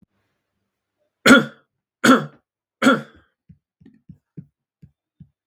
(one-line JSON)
{"three_cough_length": "5.5 s", "three_cough_amplitude": 32768, "three_cough_signal_mean_std_ratio": 0.24, "survey_phase": "beta (2021-08-13 to 2022-03-07)", "age": "18-44", "gender": "Male", "wearing_mask": "No", "symptom_fatigue": true, "smoker_status": "Never smoked", "respiratory_condition_asthma": false, "respiratory_condition_other": false, "recruitment_source": "Test and Trace", "submission_delay": "1 day", "covid_test_result": "Positive", "covid_test_method": "RT-qPCR", "covid_ct_value": 34.1, "covid_ct_gene": "ORF1ab gene"}